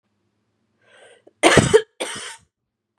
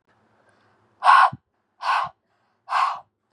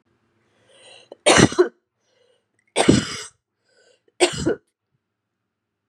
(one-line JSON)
{"cough_length": "3.0 s", "cough_amplitude": 32768, "cough_signal_mean_std_ratio": 0.29, "exhalation_length": "3.3 s", "exhalation_amplitude": 26781, "exhalation_signal_mean_std_ratio": 0.36, "three_cough_length": "5.9 s", "three_cough_amplitude": 32767, "three_cough_signal_mean_std_ratio": 0.29, "survey_phase": "beta (2021-08-13 to 2022-03-07)", "age": "18-44", "gender": "Female", "wearing_mask": "No", "symptom_none": true, "smoker_status": "Never smoked", "respiratory_condition_asthma": true, "respiratory_condition_other": false, "recruitment_source": "REACT", "submission_delay": "2 days", "covid_test_result": "Negative", "covid_test_method": "RT-qPCR", "influenza_a_test_result": "Negative", "influenza_b_test_result": "Negative"}